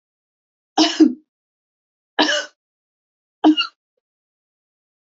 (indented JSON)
{
  "three_cough_length": "5.1 s",
  "three_cough_amplitude": 27199,
  "three_cough_signal_mean_std_ratio": 0.28,
  "survey_phase": "beta (2021-08-13 to 2022-03-07)",
  "age": "65+",
  "gender": "Female",
  "wearing_mask": "No",
  "symptom_none": true,
  "smoker_status": "Never smoked",
  "respiratory_condition_asthma": false,
  "respiratory_condition_other": false,
  "recruitment_source": "REACT",
  "submission_delay": "2 days",
  "covid_test_result": "Positive",
  "covid_test_method": "RT-qPCR",
  "covid_ct_value": 32.7,
  "covid_ct_gene": "N gene",
  "influenza_a_test_result": "Negative",
  "influenza_b_test_result": "Negative"
}